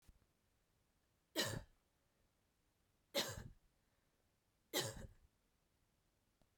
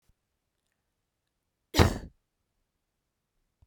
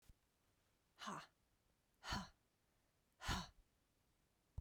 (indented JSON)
{
  "three_cough_length": "6.6 s",
  "three_cough_amplitude": 1588,
  "three_cough_signal_mean_std_ratio": 0.29,
  "cough_length": "3.7 s",
  "cough_amplitude": 22207,
  "cough_signal_mean_std_ratio": 0.16,
  "exhalation_length": "4.6 s",
  "exhalation_amplitude": 881,
  "exhalation_signal_mean_std_ratio": 0.33,
  "survey_phase": "beta (2021-08-13 to 2022-03-07)",
  "age": "45-64",
  "gender": "Female",
  "wearing_mask": "No",
  "symptom_runny_or_blocked_nose": true,
  "symptom_headache": true,
  "symptom_change_to_sense_of_smell_or_taste": true,
  "symptom_onset": "2 days",
  "smoker_status": "Ex-smoker",
  "respiratory_condition_asthma": false,
  "respiratory_condition_other": false,
  "recruitment_source": "Test and Trace",
  "submission_delay": "2 days",
  "covid_test_result": "Positive",
  "covid_test_method": "RT-qPCR"
}